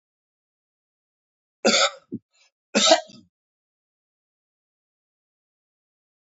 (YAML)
cough_length: 6.2 s
cough_amplitude: 26276
cough_signal_mean_std_ratio: 0.22
survey_phase: beta (2021-08-13 to 2022-03-07)
age: 65+
gender: Male
wearing_mask: 'No'
symptom_cough_any: true
symptom_shortness_of_breath: true
symptom_change_to_sense_of_smell_or_taste: true
symptom_onset: 9 days
smoker_status: Never smoked
respiratory_condition_asthma: false
respiratory_condition_other: false
recruitment_source: Test and Trace
submission_delay: 2 days
covid_test_result: Positive
covid_test_method: RT-qPCR
covid_ct_value: 13.5
covid_ct_gene: S gene
covid_ct_mean: 14.3
covid_viral_load: 20000000 copies/ml
covid_viral_load_category: High viral load (>1M copies/ml)